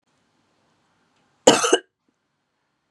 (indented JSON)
{
  "cough_length": "2.9 s",
  "cough_amplitude": 32768,
  "cough_signal_mean_std_ratio": 0.22,
  "survey_phase": "beta (2021-08-13 to 2022-03-07)",
  "age": "18-44",
  "gender": "Female",
  "wearing_mask": "No",
  "symptom_headache": true,
  "smoker_status": "Never smoked",
  "respiratory_condition_asthma": true,
  "respiratory_condition_other": false,
  "recruitment_source": "REACT",
  "submission_delay": "3 days",
  "covid_test_result": "Negative",
  "covid_test_method": "RT-qPCR",
  "influenza_a_test_result": "Negative",
  "influenza_b_test_result": "Negative"
}